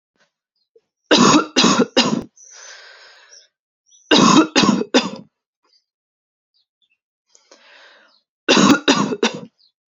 three_cough_length: 9.9 s
three_cough_amplitude: 32767
three_cough_signal_mean_std_ratio: 0.39
survey_phase: alpha (2021-03-01 to 2021-08-12)
age: 18-44
gender: Female
wearing_mask: 'No'
symptom_shortness_of_breath: true
symptom_fatigue: true
symptom_fever_high_temperature: true
symptom_headache: true
symptom_onset: 3 days
smoker_status: Never smoked
respiratory_condition_asthma: false
respiratory_condition_other: false
recruitment_source: Test and Trace
submission_delay: 1 day
covid_test_result: Positive
covid_test_method: RT-qPCR
covid_ct_value: 30.7
covid_ct_gene: N gene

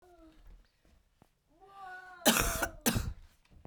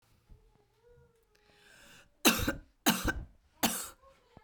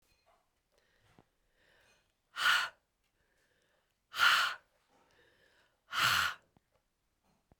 cough_length: 3.7 s
cough_amplitude: 11956
cough_signal_mean_std_ratio: 0.37
three_cough_length: 4.4 s
three_cough_amplitude: 11402
three_cough_signal_mean_std_ratio: 0.32
exhalation_length: 7.6 s
exhalation_amplitude: 6013
exhalation_signal_mean_std_ratio: 0.3
survey_phase: beta (2021-08-13 to 2022-03-07)
age: 18-44
gender: Female
wearing_mask: 'No'
symptom_cough_any: true
symptom_new_continuous_cough: true
symptom_sore_throat: true
symptom_headache: true
symptom_other: true
smoker_status: Never smoked
respiratory_condition_asthma: false
respiratory_condition_other: false
recruitment_source: Test and Trace
submission_delay: 1 day
covid_test_result: Positive
covid_test_method: ePCR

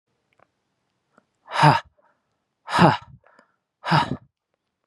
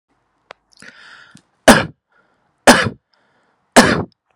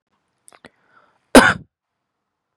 exhalation_length: 4.9 s
exhalation_amplitude: 31635
exhalation_signal_mean_std_ratio: 0.29
three_cough_length: 4.4 s
three_cough_amplitude: 32768
three_cough_signal_mean_std_ratio: 0.28
cough_length: 2.6 s
cough_amplitude: 32768
cough_signal_mean_std_ratio: 0.2
survey_phase: beta (2021-08-13 to 2022-03-07)
age: 18-44
gender: Male
wearing_mask: 'No'
symptom_none: true
smoker_status: Never smoked
respiratory_condition_asthma: false
respiratory_condition_other: false
recruitment_source: REACT
submission_delay: 2 days
covid_test_result: Negative
covid_test_method: RT-qPCR
influenza_a_test_result: Negative
influenza_b_test_result: Negative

